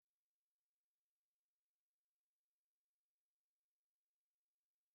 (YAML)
three_cough_length: 4.9 s
three_cough_amplitude: 2
three_cough_signal_mean_std_ratio: 0.15
survey_phase: beta (2021-08-13 to 2022-03-07)
age: 18-44
gender: Female
wearing_mask: 'No'
symptom_fatigue: true
smoker_status: Never smoked
respiratory_condition_asthma: false
respiratory_condition_other: false
recruitment_source: REACT
submission_delay: 3 days
covid_test_result: Negative
covid_test_method: RT-qPCR
influenza_a_test_result: Negative
influenza_b_test_result: Negative